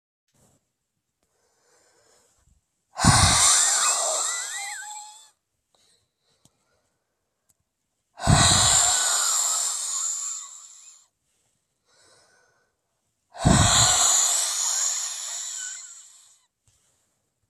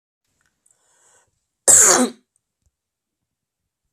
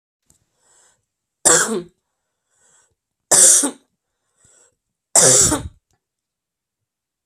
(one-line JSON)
{"exhalation_length": "17.5 s", "exhalation_amplitude": 24345, "exhalation_signal_mean_std_ratio": 0.47, "cough_length": "3.9 s", "cough_amplitude": 32768, "cough_signal_mean_std_ratio": 0.26, "three_cough_length": "7.3 s", "three_cough_amplitude": 32768, "three_cough_signal_mean_std_ratio": 0.31, "survey_phase": "beta (2021-08-13 to 2022-03-07)", "age": "45-64", "gender": "Female", "wearing_mask": "No", "symptom_none": true, "smoker_status": "Never smoked", "respiratory_condition_asthma": true, "respiratory_condition_other": false, "recruitment_source": "REACT", "submission_delay": "2 days", "covid_test_result": "Negative", "covid_test_method": "RT-qPCR", "influenza_a_test_result": "Unknown/Void", "influenza_b_test_result": "Unknown/Void"}